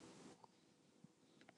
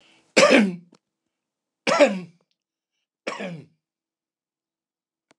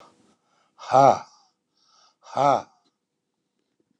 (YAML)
cough_length: 1.6 s
cough_amplitude: 161
cough_signal_mean_std_ratio: 0.8
three_cough_length: 5.4 s
three_cough_amplitude: 29203
three_cough_signal_mean_std_ratio: 0.29
exhalation_length: 4.0 s
exhalation_amplitude: 23531
exhalation_signal_mean_std_ratio: 0.26
survey_phase: alpha (2021-03-01 to 2021-08-12)
age: 65+
gender: Male
wearing_mask: 'No'
symptom_none: true
smoker_status: Ex-smoker
respiratory_condition_asthma: false
respiratory_condition_other: false
recruitment_source: REACT
submission_delay: 2 days
covid_test_result: Negative
covid_test_method: RT-qPCR